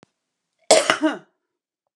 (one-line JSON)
{"cough_length": "2.0 s", "cough_amplitude": 32767, "cough_signal_mean_std_ratio": 0.31, "survey_phase": "beta (2021-08-13 to 2022-03-07)", "age": "45-64", "gender": "Female", "wearing_mask": "No", "symptom_none": true, "smoker_status": "Current smoker (e-cigarettes or vapes only)", "respiratory_condition_asthma": false, "respiratory_condition_other": false, "recruitment_source": "REACT", "submission_delay": "2 days", "covid_test_result": "Negative", "covid_test_method": "RT-qPCR"}